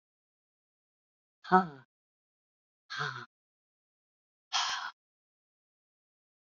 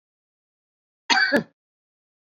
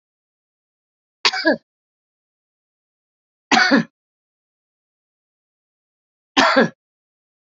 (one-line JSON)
{"exhalation_length": "6.5 s", "exhalation_amplitude": 11249, "exhalation_signal_mean_std_ratio": 0.21, "cough_length": "2.3 s", "cough_amplitude": 19739, "cough_signal_mean_std_ratio": 0.29, "three_cough_length": "7.6 s", "three_cough_amplitude": 32767, "three_cough_signal_mean_std_ratio": 0.26, "survey_phase": "beta (2021-08-13 to 2022-03-07)", "age": "65+", "gender": "Female", "wearing_mask": "No", "symptom_none": true, "smoker_status": "Ex-smoker", "respiratory_condition_asthma": false, "respiratory_condition_other": true, "recruitment_source": "REACT", "submission_delay": "2 days", "covid_test_result": "Negative", "covid_test_method": "RT-qPCR", "influenza_a_test_result": "Negative", "influenza_b_test_result": "Negative"}